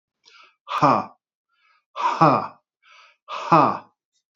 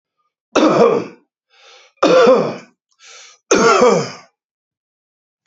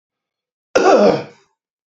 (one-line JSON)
{"exhalation_length": "4.4 s", "exhalation_amplitude": 27527, "exhalation_signal_mean_std_ratio": 0.37, "three_cough_length": "5.5 s", "three_cough_amplitude": 28829, "three_cough_signal_mean_std_ratio": 0.47, "cough_length": "2.0 s", "cough_amplitude": 28328, "cough_signal_mean_std_ratio": 0.4, "survey_phase": "beta (2021-08-13 to 2022-03-07)", "age": "45-64", "gender": "Male", "wearing_mask": "No", "symptom_cough_any": true, "symptom_shortness_of_breath": true, "symptom_fatigue": true, "symptom_fever_high_temperature": true, "symptom_other": true, "symptom_onset": "3 days", "smoker_status": "Never smoked", "respiratory_condition_asthma": false, "respiratory_condition_other": false, "recruitment_source": "Test and Trace", "submission_delay": "1 day", "covid_test_result": "Positive", "covid_test_method": "RT-qPCR", "covid_ct_value": 16.4, "covid_ct_gene": "ORF1ab gene", "covid_ct_mean": 17.3, "covid_viral_load": "2100000 copies/ml", "covid_viral_load_category": "High viral load (>1M copies/ml)"}